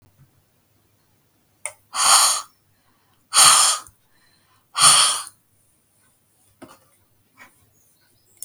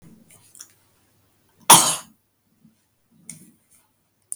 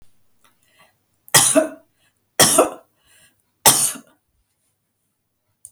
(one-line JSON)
{"exhalation_length": "8.4 s", "exhalation_amplitude": 32768, "exhalation_signal_mean_std_ratio": 0.32, "cough_length": "4.4 s", "cough_amplitude": 32768, "cough_signal_mean_std_ratio": 0.19, "three_cough_length": "5.7 s", "three_cough_amplitude": 32768, "three_cough_signal_mean_std_ratio": 0.3, "survey_phase": "beta (2021-08-13 to 2022-03-07)", "age": "65+", "gender": "Female", "wearing_mask": "No", "symptom_none": true, "smoker_status": "Never smoked", "respiratory_condition_asthma": false, "respiratory_condition_other": false, "recruitment_source": "REACT", "submission_delay": "2 days", "covid_test_result": "Negative", "covid_test_method": "RT-qPCR", "influenza_a_test_result": "Negative", "influenza_b_test_result": "Negative"}